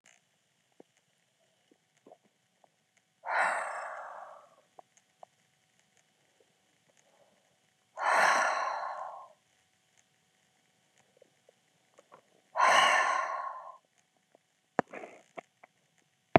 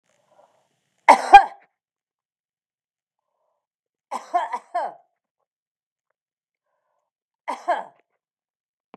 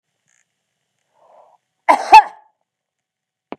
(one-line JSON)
{"exhalation_length": "16.4 s", "exhalation_amplitude": 23825, "exhalation_signal_mean_std_ratio": 0.31, "three_cough_length": "9.0 s", "three_cough_amplitude": 32768, "three_cough_signal_mean_std_ratio": 0.17, "cough_length": "3.6 s", "cough_amplitude": 32768, "cough_signal_mean_std_ratio": 0.2, "survey_phase": "beta (2021-08-13 to 2022-03-07)", "age": "65+", "gender": "Female", "wearing_mask": "No", "symptom_none": true, "smoker_status": "Ex-smoker", "respiratory_condition_asthma": false, "respiratory_condition_other": false, "recruitment_source": "REACT", "submission_delay": "2 days", "covid_test_result": "Negative", "covid_test_method": "RT-qPCR", "influenza_a_test_result": "Negative", "influenza_b_test_result": "Negative"}